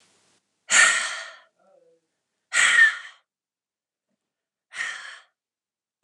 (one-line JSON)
{"exhalation_length": "6.0 s", "exhalation_amplitude": 22118, "exhalation_signal_mean_std_ratio": 0.32, "survey_phase": "beta (2021-08-13 to 2022-03-07)", "age": "45-64", "gender": "Female", "wearing_mask": "No", "symptom_fatigue": true, "smoker_status": "Never smoked", "respiratory_condition_asthma": false, "respiratory_condition_other": false, "recruitment_source": "Test and Trace", "submission_delay": "2 days", "covid_test_result": "Positive", "covid_test_method": "RT-qPCR", "covid_ct_value": 37.2, "covid_ct_gene": "ORF1ab gene"}